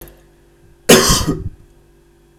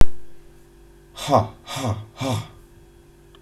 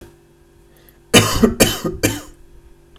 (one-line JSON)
{"cough_length": "2.4 s", "cough_amplitude": 32768, "cough_signal_mean_std_ratio": 0.36, "exhalation_length": "3.4 s", "exhalation_amplitude": 32768, "exhalation_signal_mean_std_ratio": 0.34, "three_cough_length": "3.0 s", "three_cough_amplitude": 32768, "three_cough_signal_mean_std_ratio": 0.39, "survey_phase": "beta (2021-08-13 to 2022-03-07)", "age": "18-44", "gender": "Male", "wearing_mask": "No", "symptom_cough_any": true, "symptom_sore_throat": true, "symptom_fatigue": true, "symptom_onset": "7 days", "smoker_status": "Never smoked", "respiratory_condition_asthma": true, "respiratory_condition_other": false, "recruitment_source": "REACT", "submission_delay": "2 days", "covid_test_result": "Negative", "covid_test_method": "RT-qPCR"}